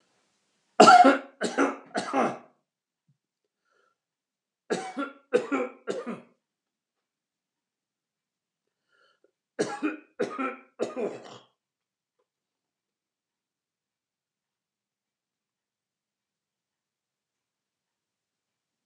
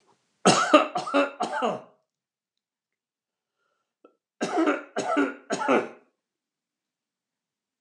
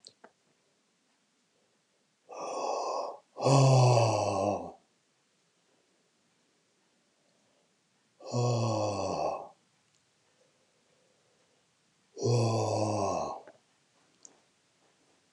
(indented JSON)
{
  "three_cough_length": "18.9 s",
  "three_cough_amplitude": 26321,
  "three_cough_signal_mean_std_ratio": 0.22,
  "cough_length": "7.8 s",
  "cough_amplitude": 23239,
  "cough_signal_mean_std_ratio": 0.38,
  "exhalation_length": "15.3 s",
  "exhalation_amplitude": 9341,
  "exhalation_signal_mean_std_ratio": 0.42,
  "survey_phase": "beta (2021-08-13 to 2022-03-07)",
  "age": "65+",
  "gender": "Male",
  "wearing_mask": "No",
  "symptom_none": true,
  "smoker_status": "Never smoked",
  "respiratory_condition_asthma": false,
  "respiratory_condition_other": false,
  "recruitment_source": "REACT",
  "submission_delay": "2 days",
  "covid_test_result": "Negative",
  "covid_test_method": "RT-qPCR"
}